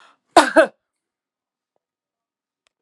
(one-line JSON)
{"cough_length": "2.8 s", "cough_amplitude": 32768, "cough_signal_mean_std_ratio": 0.21, "survey_phase": "alpha (2021-03-01 to 2021-08-12)", "age": "45-64", "gender": "Female", "wearing_mask": "No", "symptom_none": true, "smoker_status": "Ex-smoker", "respiratory_condition_asthma": true, "respiratory_condition_other": false, "recruitment_source": "Test and Trace", "submission_delay": "2 days", "covid_test_result": "Positive", "covid_test_method": "LAMP"}